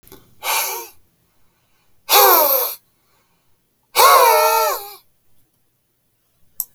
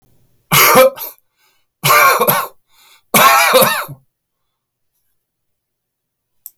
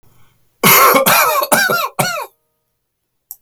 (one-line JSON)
{"exhalation_length": "6.7 s", "exhalation_amplitude": 32768, "exhalation_signal_mean_std_ratio": 0.42, "three_cough_length": "6.6 s", "three_cough_amplitude": 32768, "three_cough_signal_mean_std_ratio": 0.43, "cough_length": "3.4 s", "cough_amplitude": 32768, "cough_signal_mean_std_ratio": 0.55, "survey_phase": "beta (2021-08-13 to 2022-03-07)", "age": "65+", "gender": "Male", "wearing_mask": "No", "symptom_cough_any": true, "smoker_status": "Never smoked", "respiratory_condition_asthma": false, "respiratory_condition_other": false, "recruitment_source": "Test and Trace", "submission_delay": "2 days", "covid_test_result": "Positive", "covid_test_method": "ePCR"}